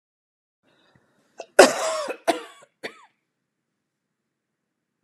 {
  "cough_length": "5.0 s",
  "cough_amplitude": 32768,
  "cough_signal_mean_std_ratio": 0.2,
  "survey_phase": "alpha (2021-03-01 to 2021-08-12)",
  "age": "45-64",
  "gender": "Female",
  "wearing_mask": "No",
  "symptom_none": true,
  "smoker_status": "Never smoked",
  "respiratory_condition_asthma": false,
  "respiratory_condition_other": false,
  "recruitment_source": "REACT",
  "submission_delay": "1 day",
  "covid_test_result": "Negative",
  "covid_test_method": "RT-qPCR"
}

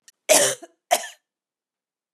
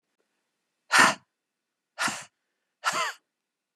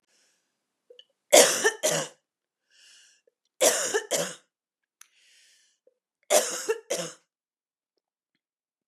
{
  "cough_length": "2.1 s",
  "cough_amplitude": 26771,
  "cough_signal_mean_std_ratio": 0.31,
  "exhalation_length": "3.8 s",
  "exhalation_amplitude": 19691,
  "exhalation_signal_mean_std_ratio": 0.29,
  "three_cough_length": "8.9 s",
  "three_cough_amplitude": 28217,
  "three_cough_signal_mean_std_ratio": 0.3,
  "survey_phase": "beta (2021-08-13 to 2022-03-07)",
  "age": "45-64",
  "gender": "Female",
  "wearing_mask": "No",
  "symptom_none": true,
  "smoker_status": "Never smoked",
  "respiratory_condition_asthma": false,
  "respiratory_condition_other": false,
  "recruitment_source": "REACT",
  "submission_delay": "6 days",
  "covid_test_result": "Negative",
  "covid_test_method": "RT-qPCR",
  "influenza_a_test_result": "Negative",
  "influenza_b_test_result": "Negative"
}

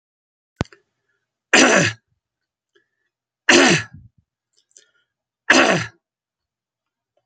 {
  "three_cough_length": "7.3 s",
  "three_cough_amplitude": 32767,
  "three_cough_signal_mean_std_ratio": 0.3,
  "survey_phase": "beta (2021-08-13 to 2022-03-07)",
  "age": "65+",
  "gender": "Male",
  "wearing_mask": "No",
  "symptom_none": true,
  "smoker_status": "Never smoked",
  "respiratory_condition_asthma": false,
  "respiratory_condition_other": false,
  "recruitment_source": "REACT",
  "submission_delay": "1 day",
  "covid_test_result": "Negative",
  "covid_test_method": "RT-qPCR"
}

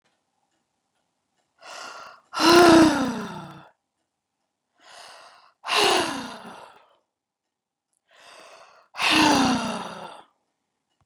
{
  "exhalation_length": "11.1 s",
  "exhalation_amplitude": 26945,
  "exhalation_signal_mean_std_ratio": 0.35,
  "survey_phase": "beta (2021-08-13 to 2022-03-07)",
  "age": "45-64",
  "gender": "Female",
  "wearing_mask": "No",
  "symptom_none": true,
  "smoker_status": "Never smoked",
  "respiratory_condition_asthma": false,
  "respiratory_condition_other": false,
  "recruitment_source": "REACT",
  "submission_delay": "3 days",
  "covid_test_result": "Negative",
  "covid_test_method": "RT-qPCR",
  "influenza_a_test_result": "Negative",
  "influenza_b_test_result": "Negative"
}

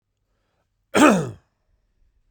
{
  "cough_length": "2.3 s",
  "cough_amplitude": 26064,
  "cough_signal_mean_std_ratio": 0.3,
  "survey_phase": "beta (2021-08-13 to 2022-03-07)",
  "age": "18-44",
  "gender": "Male",
  "wearing_mask": "No",
  "symptom_none": true,
  "symptom_onset": "9 days",
  "smoker_status": "Never smoked",
  "recruitment_source": "REACT",
  "submission_delay": "2 days",
  "covid_test_result": "Negative",
  "covid_test_method": "RT-qPCR",
  "influenza_a_test_result": "Negative",
  "influenza_b_test_result": "Negative"
}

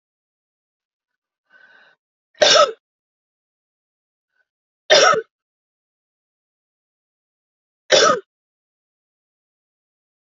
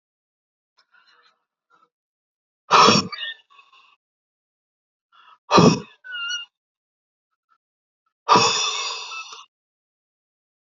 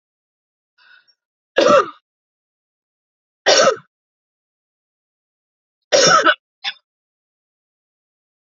{
  "three_cough_length": "10.2 s",
  "three_cough_amplitude": 30561,
  "three_cough_signal_mean_std_ratio": 0.23,
  "exhalation_length": "10.7 s",
  "exhalation_amplitude": 28962,
  "exhalation_signal_mean_std_ratio": 0.28,
  "cough_length": "8.5 s",
  "cough_amplitude": 31144,
  "cough_signal_mean_std_ratio": 0.28,
  "survey_phase": "alpha (2021-03-01 to 2021-08-12)",
  "age": "65+",
  "gender": "Female",
  "wearing_mask": "No",
  "symptom_none": true,
  "smoker_status": "Ex-smoker",
  "respiratory_condition_asthma": false,
  "respiratory_condition_other": false,
  "recruitment_source": "REACT",
  "submission_delay": "2 days",
  "covid_test_result": "Negative",
  "covid_test_method": "RT-qPCR"
}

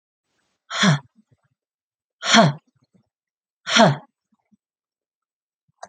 {
  "exhalation_length": "5.9 s",
  "exhalation_amplitude": 27919,
  "exhalation_signal_mean_std_ratio": 0.28,
  "survey_phase": "alpha (2021-03-01 to 2021-08-12)",
  "age": "45-64",
  "gender": "Female",
  "wearing_mask": "No",
  "symptom_abdominal_pain": true,
  "symptom_fatigue": true,
  "symptom_onset": "6 days",
  "smoker_status": "Never smoked",
  "respiratory_condition_asthma": false,
  "respiratory_condition_other": false,
  "recruitment_source": "REACT",
  "submission_delay": "1 day",
  "covid_test_result": "Negative",
  "covid_test_method": "RT-qPCR"
}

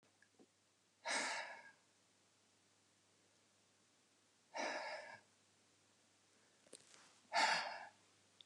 {
  "exhalation_length": "8.5 s",
  "exhalation_amplitude": 2188,
  "exhalation_signal_mean_std_ratio": 0.34,
  "survey_phase": "beta (2021-08-13 to 2022-03-07)",
  "age": "45-64",
  "gender": "Female",
  "wearing_mask": "No",
  "symptom_none": true,
  "smoker_status": "Current smoker (11 or more cigarettes per day)",
  "respiratory_condition_asthma": false,
  "respiratory_condition_other": false,
  "recruitment_source": "REACT",
  "submission_delay": "1 day",
  "covid_test_result": "Negative",
  "covid_test_method": "RT-qPCR"
}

